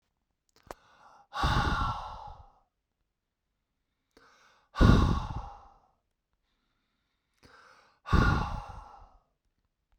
{"exhalation_length": "10.0 s", "exhalation_amplitude": 17586, "exhalation_signal_mean_std_ratio": 0.32, "survey_phase": "beta (2021-08-13 to 2022-03-07)", "age": "18-44", "gender": "Male", "wearing_mask": "No", "symptom_cough_any": true, "symptom_fatigue": true, "symptom_fever_high_temperature": true, "symptom_headache": true, "smoker_status": "Never smoked", "respiratory_condition_asthma": false, "respiratory_condition_other": false, "recruitment_source": "Test and Trace", "submission_delay": "2 days", "covid_test_result": "Positive", "covid_test_method": "RT-qPCR", "covid_ct_value": 26.0, "covid_ct_gene": "ORF1ab gene"}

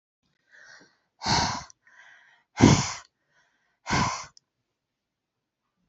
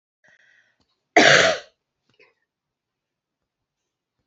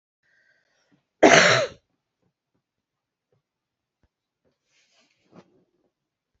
{"exhalation_length": "5.9 s", "exhalation_amplitude": 26765, "exhalation_signal_mean_std_ratio": 0.29, "three_cough_length": "4.3 s", "three_cough_amplitude": 27580, "three_cough_signal_mean_std_ratio": 0.24, "cough_length": "6.4 s", "cough_amplitude": 27561, "cough_signal_mean_std_ratio": 0.2, "survey_phase": "beta (2021-08-13 to 2022-03-07)", "age": "45-64", "gender": "Female", "wearing_mask": "No", "symptom_cough_any": true, "symptom_runny_or_blocked_nose": true, "symptom_fatigue": true, "symptom_headache": true, "symptom_onset": "3 days", "smoker_status": "Never smoked", "respiratory_condition_asthma": false, "respiratory_condition_other": true, "recruitment_source": "Test and Trace", "submission_delay": "2 days", "covid_test_result": "Positive", "covid_test_method": "RT-qPCR", "covid_ct_value": 12.5, "covid_ct_gene": "ORF1ab gene", "covid_ct_mean": 13.1, "covid_viral_load": "51000000 copies/ml", "covid_viral_load_category": "High viral load (>1M copies/ml)"}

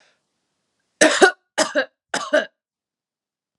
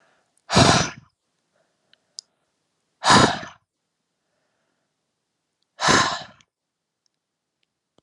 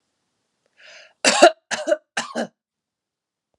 {"three_cough_length": "3.6 s", "three_cough_amplitude": 32411, "three_cough_signal_mean_std_ratio": 0.32, "exhalation_length": "8.0 s", "exhalation_amplitude": 29180, "exhalation_signal_mean_std_ratio": 0.28, "cough_length": "3.6 s", "cough_amplitude": 32768, "cough_signal_mean_std_ratio": 0.27, "survey_phase": "alpha (2021-03-01 to 2021-08-12)", "age": "18-44", "gender": "Female", "wearing_mask": "No", "symptom_fatigue": true, "smoker_status": "Ex-smoker", "respiratory_condition_asthma": false, "respiratory_condition_other": false, "recruitment_source": "Test and Trace", "submission_delay": "2 days", "covid_test_result": "Positive", "covid_test_method": "RT-qPCR", "covid_ct_value": 11.9, "covid_ct_gene": "ORF1ab gene", "covid_ct_mean": 12.1, "covid_viral_load": "110000000 copies/ml", "covid_viral_load_category": "High viral load (>1M copies/ml)"}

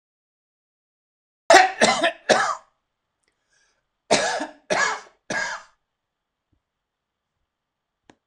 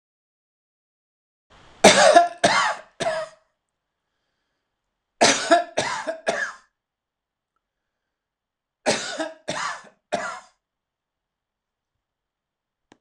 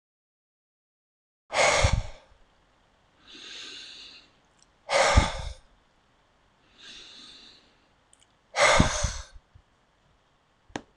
{"cough_length": "8.3 s", "cough_amplitude": 26028, "cough_signal_mean_std_ratio": 0.31, "three_cough_length": "13.0 s", "three_cough_amplitude": 26028, "three_cough_signal_mean_std_ratio": 0.31, "exhalation_length": "11.0 s", "exhalation_amplitude": 20760, "exhalation_signal_mean_std_ratio": 0.32, "survey_phase": "alpha (2021-03-01 to 2021-08-12)", "age": "65+", "gender": "Male", "wearing_mask": "No", "symptom_none": true, "smoker_status": "Never smoked", "respiratory_condition_asthma": false, "respiratory_condition_other": false, "recruitment_source": "REACT", "submission_delay": "3 days", "covid_test_result": "Negative", "covid_test_method": "RT-qPCR"}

